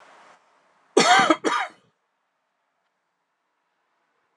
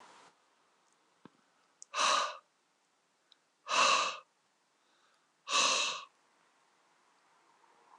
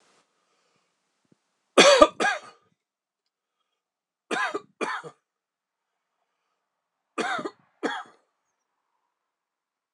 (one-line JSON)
{"cough_length": "4.4 s", "cough_amplitude": 22691, "cough_signal_mean_std_ratio": 0.28, "exhalation_length": "8.0 s", "exhalation_amplitude": 5679, "exhalation_signal_mean_std_ratio": 0.34, "three_cough_length": "9.9 s", "three_cough_amplitude": 26027, "three_cough_signal_mean_std_ratio": 0.23, "survey_phase": "beta (2021-08-13 to 2022-03-07)", "age": "45-64", "gender": "Male", "wearing_mask": "No", "symptom_runny_or_blocked_nose": true, "symptom_onset": "4 days", "smoker_status": "Ex-smoker", "respiratory_condition_asthma": false, "respiratory_condition_other": false, "recruitment_source": "Test and Trace", "submission_delay": "2 days", "covid_test_result": "Positive", "covid_test_method": "RT-qPCR", "covid_ct_value": 13.9, "covid_ct_gene": "ORF1ab gene", "covid_ct_mean": 14.1, "covid_viral_load": "24000000 copies/ml", "covid_viral_load_category": "High viral load (>1M copies/ml)"}